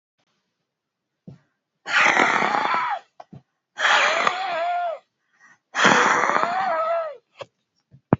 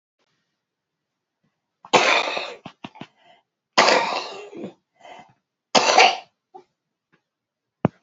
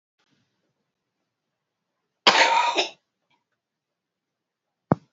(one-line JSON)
{"exhalation_length": "8.2 s", "exhalation_amplitude": 32610, "exhalation_signal_mean_std_ratio": 0.55, "three_cough_length": "8.0 s", "three_cough_amplitude": 31993, "three_cough_signal_mean_std_ratio": 0.32, "cough_length": "5.1 s", "cough_amplitude": 32767, "cough_signal_mean_std_ratio": 0.26, "survey_phase": "beta (2021-08-13 to 2022-03-07)", "age": "65+", "gender": "Female", "wearing_mask": "No", "symptom_cough_any": true, "symptom_runny_or_blocked_nose": true, "symptom_shortness_of_breath": true, "symptom_onset": "13 days", "smoker_status": "Never smoked", "respiratory_condition_asthma": false, "respiratory_condition_other": true, "recruitment_source": "REACT", "submission_delay": "2 days", "covid_test_result": "Negative", "covid_test_method": "RT-qPCR", "influenza_a_test_result": "Negative", "influenza_b_test_result": "Negative"}